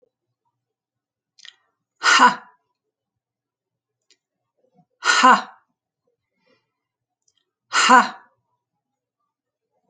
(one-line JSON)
{"exhalation_length": "9.9 s", "exhalation_amplitude": 29221, "exhalation_signal_mean_std_ratio": 0.24, "survey_phase": "alpha (2021-03-01 to 2021-08-12)", "age": "65+", "gender": "Female", "wearing_mask": "No", "symptom_none": true, "smoker_status": "Ex-smoker", "respiratory_condition_asthma": false, "respiratory_condition_other": false, "recruitment_source": "REACT", "submission_delay": "1 day", "covid_test_result": "Negative", "covid_test_method": "RT-qPCR"}